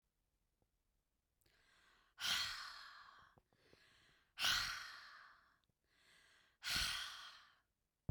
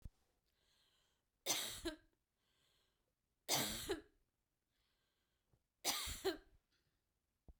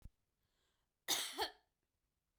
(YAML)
exhalation_length: 8.1 s
exhalation_amplitude: 2264
exhalation_signal_mean_std_ratio: 0.38
three_cough_length: 7.6 s
three_cough_amplitude: 2007
three_cough_signal_mean_std_ratio: 0.34
cough_length: 2.4 s
cough_amplitude: 2249
cough_signal_mean_std_ratio: 0.31
survey_phase: beta (2021-08-13 to 2022-03-07)
age: 45-64
gender: Female
wearing_mask: 'No'
symptom_headache: true
smoker_status: Never smoked
respiratory_condition_asthma: false
respiratory_condition_other: false
recruitment_source: REACT
submission_delay: 1 day
covid_test_result: Negative
covid_test_method: RT-qPCR